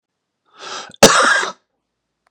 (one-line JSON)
{"cough_length": "2.3 s", "cough_amplitude": 32768, "cough_signal_mean_std_ratio": 0.36, "survey_phase": "beta (2021-08-13 to 2022-03-07)", "age": "18-44", "gender": "Male", "wearing_mask": "No", "symptom_cough_any": true, "symptom_runny_or_blocked_nose": true, "symptom_shortness_of_breath": true, "symptom_sore_throat": true, "symptom_abdominal_pain": true, "symptom_fatigue": true, "symptom_headache": true, "symptom_change_to_sense_of_smell_or_taste": true, "symptom_loss_of_taste": true, "symptom_onset": "4 days", "smoker_status": "Current smoker (11 or more cigarettes per day)", "respiratory_condition_asthma": true, "respiratory_condition_other": false, "recruitment_source": "Test and Trace", "submission_delay": "2 days", "covid_test_result": "Positive", "covid_test_method": "ePCR"}